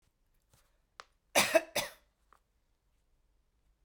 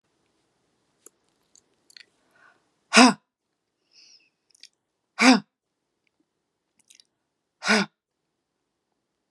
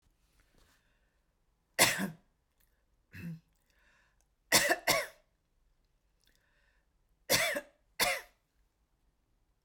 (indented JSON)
{
  "cough_length": "3.8 s",
  "cough_amplitude": 8430,
  "cough_signal_mean_std_ratio": 0.22,
  "exhalation_length": "9.3 s",
  "exhalation_amplitude": 32678,
  "exhalation_signal_mean_std_ratio": 0.19,
  "three_cough_length": "9.6 s",
  "three_cough_amplitude": 16806,
  "three_cough_signal_mean_std_ratio": 0.28,
  "survey_phase": "beta (2021-08-13 to 2022-03-07)",
  "age": "45-64",
  "gender": "Female",
  "wearing_mask": "No",
  "symptom_none": true,
  "smoker_status": "Never smoked",
  "respiratory_condition_asthma": false,
  "respiratory_condition_other": false,
  "recruitment_source": "REACT",
  "submission_delay": "1 day",
  "covid_test_result": "Negative",
  "covid_test_method": "RT-qPCR"
}